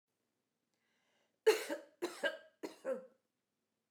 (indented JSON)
{
  "three_cough_length": "3.9 s",
  "three_cough_amplitude": 4511,
  "three_cough_signal_mean_std_ratio": 0.28,
  "survey_phase": "beta (2021-08-13 to 2022-03-07)",
  "age": "65+",
  "gender": "Female",
  "wearing_mask": "No",
  "symptom_none": true,
  "smoker_status": "Never smoked",
  "respiratory_condition_asthma": false,
  "respiratory_condition_other": false,
  "recruitment_source": "REACT",
  "submission_delay": "1 day",
  "covid_test_result": "Negative",
  "covid_test_method": "RT-qPCR"
}